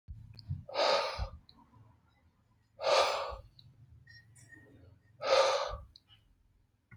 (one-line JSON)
{"exhalation_length": "7.0 s", "exhalation_amplitude": 6130, "exhalation_signal_mean_std_ratio": 0.42, "survey_phase": "alpha (2021-03-01 to 2021-08-12)", "age": "45-64", "gender": "Male", "wearing_mask": "No", "symptom_shortness_of_breath": true, "symptom_fatigue": true, "symptom_onset": "12 days", "smoker_status": "Ex-smoker", "respiratory_condition_asthma": false, "respiratory_condition_other": false, "recruitment_source": "REACT", "submission_delay": "2 days", "covid_test_result": "Negative", "covid_test_method": "RT-qPCR"}